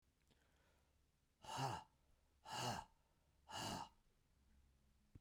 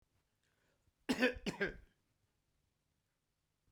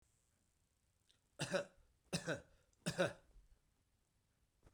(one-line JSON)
{"exhalation_length": "5.2 s", "exhalation_amplitude": 791, "exhalation_signal_mean_std_ratio": 0.41, "cough_length": "3.7 s", "cough_amplitude": 3160, "cough_signal_mean_std_ratio": 0.27, "three_cough_length": "4.7 s", "three_cough_amplitude": 1851, "three_cough_signal_mean_std_ratio": 0.31, "survey_phase": "beta (2021-08-13 to 2022-03-07)", "age": "65+", "gender": "Male", "wearing_mask": "No", "symptom_none": true, "smoker_status": "Never smoked", "respiratory_condition_asthma": false, "respiratory_condition_other": false, "recruitment_source": "REACT", "submission_delay": "2 days", "covid_test_result": "Negative", "covid_test_method": "RT-qPCR", "influenza_a_test_result": "Negative", "influenza_b_test_result": "Negative"}